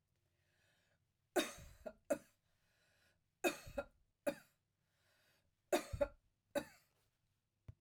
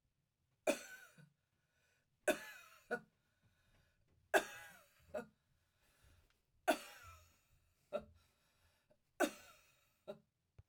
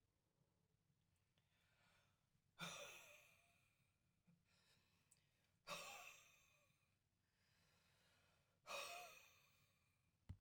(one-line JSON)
{"three_cough_length": "7.8 s", "three_cough_amplitude": 2587, "three_cough_signal_mean_std_ratio": 0.26, "cough_length": "10.7 s", "cough_amplitude": 3765, "cough_signal_mean_std_ratio": 0.23, "exhalation_length": "10.4 s", "exhalation_amplitude": 384, "exhalation_signal_mean_std_ratio": 0.39, "survey_phase": "alpha (2021-03-01 to 2021-08-12)", "age": "65+", "gender": "Female", "wearing_mask": "No", "symptom_none": true, "smoker_status": "Never smoked", "respiratory_condition_asthma": false, "respiratory_condition_other": false, "recruitment_source": "REACT", "submission_delay": "1 day", "covid_test_result": "Negative", "covid_test_method": "RT-qPCR"}